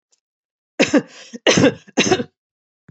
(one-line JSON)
{"cough_length": "2.9 s", "cough_amplitude": 30556, "cough_signal_mean_std_ratio": 0.38, "survey_phase": "beta (2021-08-13 to 2022-03-07)", "age": "65+", "gender": "Female", "wearing_mask": "No", "symptom_none": true, "smoker_status": "Never smoked", "respiratory_condition_asthma": false, "respiratory_condition_other": false, "recruitment_source": "REACT", "submission_delay": "2 days", "covid_test_result": "Negative", "covid_test_method": "RT-qPCR"}